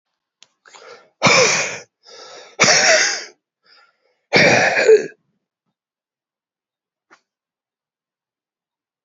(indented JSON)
{
  "exhalation_length": "9.0 s",
  "exhalation_amplitude": 32673,
  "exhalation_signal_mean_std_ratio": 0.36,
  "survey_phase": "beta (2021-08-13 to 2022-03-07)",
  "age": "45-64",
  "gender": "Male",
  "wearing_mask": "No",
  "symptom_cough_any": true,
  "symptom_runny_or_blocked_nose": true,
  "symptom_sore_throat": true,
  "symptom_abdominal_pain": true,
  "symptom_fatigue": true,
  "symptom_fever_high_temperature": true,
  "symptom_headache": true,
  "symptom_change_to_sense_of_smell_or_taste": true,
  "symptom_onset": "6 days",
  "smoker_status": "Never smoked",
  "recruitment_source": "Test and Trace",
  "submission_delay": "2 days",
  "covid_test_result": "Positive",
  "covid_test_method": "RT-qPCR",
  "covid_ct_value": 16.1,
  "covid_ct_gene": "ORF1ab gene",
  "covid_ct_mean": 16.5,
  "covid_viral_load": "4000000 copies/ml",
  "covid_viral_load_category": "High viral load (>1M copies/ml)"
}